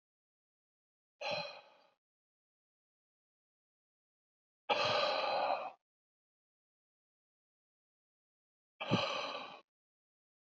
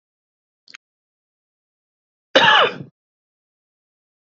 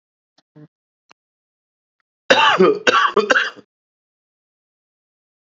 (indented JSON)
{
  "exhalation_length": "10.5 s",
  "exhalation_amplitude": 3783,
  "exhalation_signal_mean_std_ratio": 0.33,
  "cough_length": "4.4 s",
  "cough_amplitude": 28502,
  "cough_signal_mean_std_ratio": 0.23,
  "three_cough_length": "5.5 s",
  "three_cough_amplitude": 30499,
  "three_cough_signal_mean_std_ratio": 0.33,
  "survey_phase": "beta (2021-08-13 to 2022-03-07)",
  "age": "45-64",
  "gender": "Male",
  "wearing_mask": "No",
  "symptom_runny_or_blocked_nose": true,
  "smoker_status": "Current smoker (11 or more cigarettes per day)",
  "respiratory_condition_asthma": false,
  "respiratory_condition_other": false,
  "recruitment_source": "Test and Trace",
  "submission_delay": "1 day",
  "covid_test_result": "Positive",
  "covid_test_method": "RT-qPCR"
}